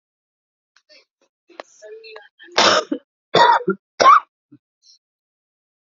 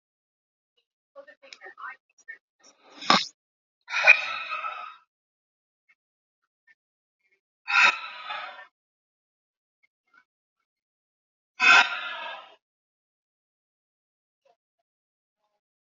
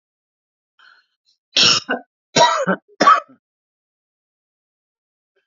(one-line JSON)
{"three_cough_length": "5.8 s", "three_cough_amplitude": 28946, "three_cough_signal_mean_std_ratio": 0.31, "exhalation_length": "15.9 s", "exhalation_amplitude": 29444, "exhalation_signal_mean_std_ratio": 0.23, "cough_length": "5.5 s", "cough_amplitude": 30672, "cough_signal_mean_std_ratio": 0.31, "survey_phase": "alpha (2021-03-01 to 2021-08-12)", "age": "65+", "gender": "Female", "wearing_mask": "No", "symptom_none": true, "smoker_status": "Current smoker (1 to 10 cigarettes per day)", "respiratory_condition_asthma": false, "respiratory_condition_other": false, "recruitment_source": "REACT", "submission_delay": "2 days", "covid_test_result": "Negative", "covid_test_method": "RT-qPCR"}